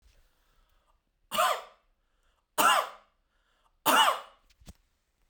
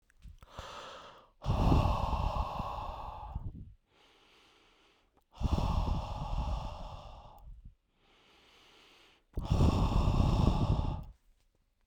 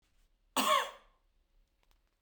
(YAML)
three_cough_length: 5.3 s
three_cough_amplitude: 11331
three_cough_signal_mean_std_ratio: 0.33
exhalation_length: 11.9 s
exhalation_amplitude: 8073
exhalation_signal_mean_std_ratio: 0.54
cough_length: 2.2 s
cough_amplitude: 5059
cough_signal_mean_std_ratio: 0.31
survey_phase: beta (2021-08-13 to 2022-03-07)
age: 18-44
gender: Male
wearing_mask: 'Yes'
symptom_none: true
smoker_status: Never smoked
respiratory_condition_asthma: false
respiratory_condition_other: false
recruitment_source: REACT
submission_delay: 4 days
covid_test_result: Negative
covid_test_method: RT-qPCR